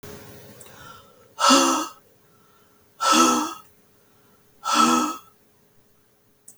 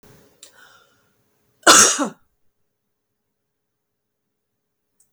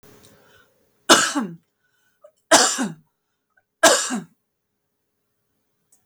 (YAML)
exhalation_length: 6.6 s
exhalation_amplitude: 24801
exhalation_signal_mean_std_ratio: 0.41
cough_length: 5.1 s
cough_amplitude: 32768
cough_signal_mean_std_ratio: 0.21
three_cough_length: 6.1 s
three_cough_amplitude: 32768
three_cough_signal_mean_std_ratio: 0.3
survey_phase: beta (2021-08-13 to 2022-03-07)
age: 45-64
gender: Female
wearing_mask: 'No'
symptom_none: true
smoker_status: Never smoked
respiratory_condition_asthma: false
respiratory_condition_other: false
recruitment_source: REACT
submission_delay: 1 day
covid_test_result: Negative
covid_test_method: RT-qPCR
influenza_a_test_result: Negative
influenza_b_test_result: Negative